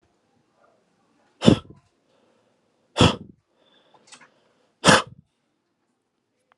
exhalation_length: 6.6 s
exhalation_amplitude: 32766
exhalation_signal_mean_std_ratio: 0.2
survey_phase: alpha (2021-03-01 to 2021-08-12)
age: 18-44
gender: Male
wearing_mask: 'No'
symptom_none: true
smoker_status: Never smoked
respiratory_condition_asthma: false
respiratory_condition_other: false
recruitment_source: REACT
submission_delay: 1 day
covid_test_result: Negative
covid_test_method: RT-qPCR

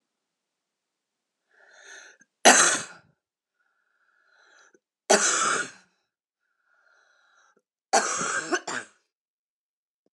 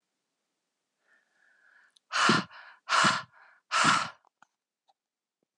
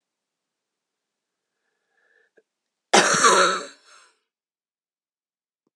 three_cough_length: 10.1 s
three_cough_amplitude: 29081
three_cough_signal_mean_std_ratio: 0.28
exhalation_length: 5.6 s
exhalation_amplitude: 11459
exhalation_signal_mean_std_ratio: 0.34
cough_length: 5.8 s
cough_amplitude: 27320
cough_signal_mean_std_ratio: 0.27
survey_phase: alpha (2021-03-01 to 2021-08-12)
age: 18-44
gender: Female
wearing_mask: 'No'
symptom_cough_any: true
symptom_shortness_of_breath: true
symptom_abdominal_pain: true
symptom_fatigue: true
symptom_change_to_sense_of_smell_or_taste: true
symptom_loss_of_taste: true
symptom_onset: 5 days
smoker_status: Current smoker (1 to 10 cigarettes per day)
respiratory_condition_asthma: true
respiratory_condition_other: false
recruitment_source: Test and Trace
submission_delay: 2 days
covid_test_result: Positive
covid_test_method: RT-qPCR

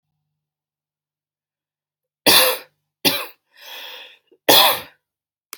three_cough_length: 5.6 s
three_cough_amplitude: 32768
three_cough_signal_mean_std_ratio: 0.3
survey_phase: alpha (2021-03-01 to 2021-08-12)
age: 18-44
gender: Female
wearing_mask: 'No'
symptom_none: true
smoker_status: Never smoked
respiratory_condition_asthma: false
respiratory_condition_other: false
recruitment_source: REACT
submission_delay: 2 days
covid_test_result: Negative
covid_test_method: RT-qPCR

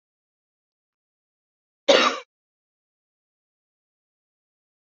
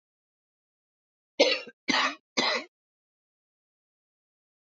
cough_length: 4.9 s
cough_amplitude: 24909
cough_signal_mean_std_ratio: 0.17
three_cough_length: 4.6 s
three_cough_amplitude: 16870
three_cough_signal_mean_std_ratio: 0.29
survey_phase: beta (2021-08-13 to 2022-03-07)
age: 45-64
gender: Female
wearing_mask: 'No'
symptom_cough_any: true
symptom_runny_or_blocked_nose: true
symptom_shortness_of_breath: true
symptom_sore_throat: true
symptom_onset: 11 days
smoker_status: Current smoker (11 or more cigarettes per day)
respiratory_condition_asthma: false
respiratory_condition_other: false
recruitment_source: REACT
submission_delay: 1 day
covid_test_result: Negative
covid_test_method: RT-qPCR
influenza_a_test_result: Unknown/Void
influenza_b_test_result: Unknown/Void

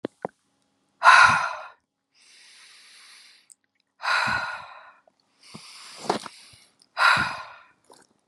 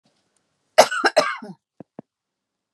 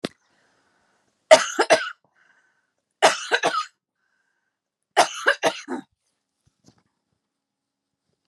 exhalation_length: 8.3 s
exhalation_amplitude: 31133
exhalation_signal_mean_std_ratio: 0.32
cough_length: 2.7 s
cough_amplitude: 32768
cough_signal_mean_std_ratio: 0.27
three_cough_length: 8.3 s
three_cough_amplitude: 32767
three_cough_signal_mean_std_ratio: 0.26
survey_phase: beta (2021-08-13 to 2022-03-07)
age: 45-64
gender: Female
wearing_mask: 'No'
symptom_none: true
smoker_status: Never smoked
respiratory_condition_asthma: true
respiratory_condition_other: false
recruitment_source: REACT
submission_delay: 3 days
covid_test_result: Negative
covid_test_method: RT-qPCR
influenza_a_test_result: Unknown/Void
influenza_b_test_result: Unknown/Void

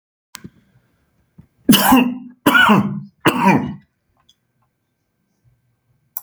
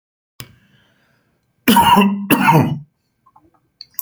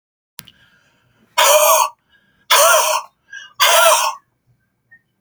three_cough_length: 6.2 s
three_cough_amplitude: 32768
three_cough_signal_mean_std_ratio: 0.38
cough_length: 4.0 s
cough_amplitude: 32767
cough_signal_mean_std_ratio: 0.43
exhalation_length: 5.2 s
exhalation_amplitude: 32768
exhalation_signal_mean_std_ratio: 0.47
survey_phase: alpha (2021-03-01 to 2021-08-12)
age: 45-64
gender: Male
wearing_mask: 'No'
symptom_none: true
smoker_status: Ex-smoker
respiratory_condition_asthma: false
respiratory_condition_other: false
recruitment_source: REACT
submission_delay: 1 day
covid_test_result: Negative
covid_test_method: RT-qPCR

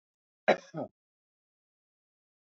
cough_length: 2.5 s
cough_amplitude: 11029
cough_signal_mean_std_ratio: 0.17
survey_phase: alpha (2021-03-01 to 2021-08-12)
age: 45-64
gender: Male
wearing_mask: 'No'
symptom_none: true
smoker_status: Never smoked
respiratory_condition_asthma: true
respiratory_condition_other: false
recruitment_source: REACT
submission_delay: 1 day
covid_test_result: Negative
covid_test_method: RT-qPCR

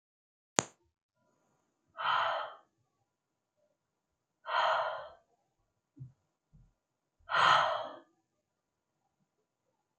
exhalation_length: 10.0 s
exhalation_amplitude: 23234
exhalation_signal_mean_std_ratio: 0.31
survey_phase: beta (2021-08-13 to 2022-03-07)
age: 45-64
gender: Female
wearing_mask: 'No'
symptom_fatigue: true
smoker_status: Never smoked
respiratory_condition_asthma: false
respiratory_condition_other: false
recruitment_source: REACT
submission_delay: 2 days
covid_test_result: Negative
covid_test_method: RT-qPCR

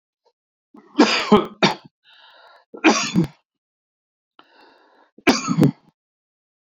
three_cough_length: 6.7 s
three_cough_amplitude: 29173
three_cough_signal_mean_std_ratio: 0.33
survey_phase: beta (2021-08-13 to 2022-03-07)
age: 65+
gender: Male
wearing_mask: 'No'
symptom_cough_any: true
symptom_onset: 12 days
smoker_status: Ex-smoker
respiratory_condition_asthma: false
respiratory_condition_other: false
recruitment_source: REACT
submission_delay: 1 day
covid_test_result: Negative
covid_test_method: RT-qPCR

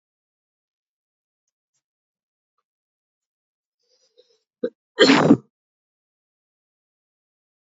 cough_length: 7.8 s
cough_amplitude: 28131
cough_signal_mean_std_ratio: 0.17
survey_phase: alpha (2021-03-01 to 2021-08-12)
age: 45-64
gender: Male
wearing_mask: 'Yes'
symptom_cough_any: true
symptom_fever_high_temperature: true
symptom_headache: true
symptom_change_to_sense_of_smell_or_taste: true
symptom_loss_of_taste: true
symptom_onset: 3 days
smoker_status: Never smoked
respiratory_condition_asthma: false
respiratory_condition_other: false
recruitment_source: Test and Trace
submission_delay: 2 days
covid_test_result: Positive
covid_test_method: RT-qPCR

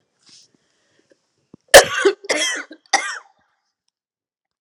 three_cough_length: 4.6 s
three_cough_amplitude: 32768
three_cough_signal_mean_std_ratio: 0.25
survey_phase: alpha (2021-03-01 to 2021-08-12)
age: 45-64
gender: Female
wearing_mask: 'No'
symptom_cough_any: true
symptom_fatigue: true
symptom_fever_high_temperature: true
symptom_headache: true
symptom_change_to_sense_of_smell_or_taste: true
symptom_onset: 3 days
smoker_status: Never smoked
respiratory_condition_asthma: false
respiratory_condition_other: false
recruitment_source: Test and Trace
submission_delay: 2 days
covid_test_result: Positive
covid_test_method: RT-qPCR
covid_ct_value: 21.0
covid_ct_gene: ORF1ab gene
covid_ct_mean: 21.6
covid_viral_load: 81000 copies/ml
covid_viral_load_category: Low viral load (10K-1M copies/ml)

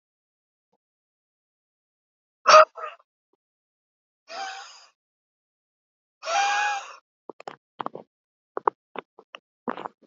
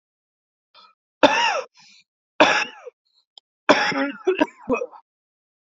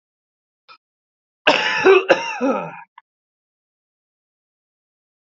exhalation_length: 10.1 s
exhalation_amplitude: 28286
exhalation_signal_mean_std_ratio: 0.2
three_cough_length: 5.6 s
three_cough_amplitude: 32767
three_cough_signal_mean_std_ratio: 0.37
cough_length: 5.3 s
cough_amplitude: 29508
cough_signal_mean_std_ratio: 0.32
survey_phase: beta (2021-08-13 to 2022-03-07)
age: 18-44
gender: Male
wearing_mask: 'No'
symptom_cough_any: true
symptom_runny_or_blocked_nose: true
symptom_shortness_of_breath: true
symptom_sore_throat: true
symptom_fatigue: true
symptom_headache: true
symptom_onset: 5 days
smoker_status: Current smoker (1 to 10 cigarettes per day)
respiratory_condition_asthma: true
respiratory_condition_other: false
recruitment_source: Test and Trace
submission_delay: 2 days
covid_test_result: Positive
covid_test_method: RT-qPCR
covid_ct_value: 14.9
covid_ct_gene: N gene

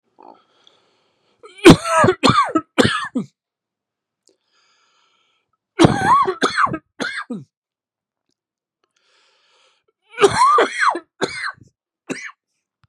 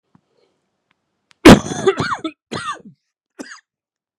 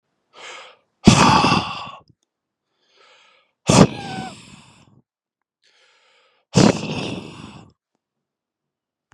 three_cough_length: 12.9 s
three_cough_amplitude: 32768
three_cough_signal_mean_std_ratio: 0.36
cough_length: 4.2 s
cough_amplitude: 32768
cough_signal_mean_std_ratio: 0.25
exhalation_length: 9.1 s
exhalation_amplitude: 32768
exhalation_signal_mean_std_ratio: 0.3
survey_phase: beta (2021-08-13 to 2022-03-07)
age: 45-64
gender: Male
wearing_mask: 'No'
symptom_cough_any: true
symptom_runny_or_blocked_nose: true
symptom_shortness_of_breath: true
symptom_fatigue: true
symptom_headache: true
symptom_onset: 3 days
smoker_status: Ex-smoker
respiratory_condition_asthma: true
respiratory_condition_other: false
recruitment_source: Test and Trace
submission_delay: 2 days
covid_test_result: Positive
covid_test_method: RT-qPCR
covid_ct_value: 17.7
covid_ct_gene: ORF1ab gene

